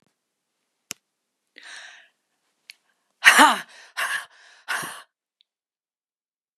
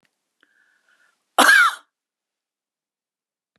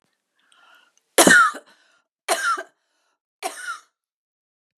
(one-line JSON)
{"exhalation_length": "6.6 s", "exhalation_amplitude": 32767, "exhalation_signal_mean_std_ratio": 0.22, "cough_length": "3.6 s", "cough_amplitude": 31698, "cough_signal_mean_std_ratio": 0.26, "three_cough_length": "4.8 s", "three_cough_amplitude": 32564, "three_cough_signal_mean_std_ratio": 0.29, "survey_phase": "beta (2021-08-13 to 2022-03-07)", "age": "65+", "gender": "Female", "wearing_mask": "No", "symptom_none": true, "smoker_status": "Never smoked", "respiratory_condition_asthma": false, "respiratory_condition_other": false, "recruitment_source": "REACT", "submission_delay": "2 days", "covid_test_result": "Negative", "covid_test_method": "RT-qPCR", "influenza_a_test_result": "Negative", "influenza_b_test_result": "Negative"}